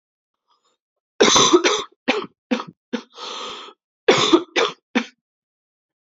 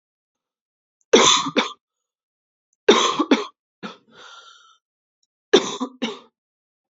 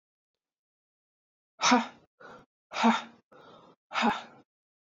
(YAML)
cough_length: 6.1 s
cough_amplitude: 29651
cough_signal_mean_std_ratio: 0.39
three_cough_length: 7.0 s
three_cough_amplitude: 28420
three_cough_signal_mean_std_ratio: 0.31
exhalation_length: 4.9 s
exhalation_amplitude: 11035
exhalation_signal_mean_std_ratio: 0.31
survey_phase: alpha (2021-03-01 to 2021-08-12)
age: 18-44
gender: Female
wearing_mask: 'No'
symptom_cough_any: true
symptom_new_continuous_cough: true
symptom_shortness_of_breath: true
symptom_fatigue: true
symptom_fever_high_temperature: true
symptom_headache: true
smoker_status: Never smoked
respiratory_condition_asthma: false
respiratory_condition_other: false
recruitment_source: Test and Trace
submission_delay: 1 day
covid_test_result: Positive
covid_test_method: RT-qPCR
covid_ct_value: 33.0
covid_ct_gene: N gene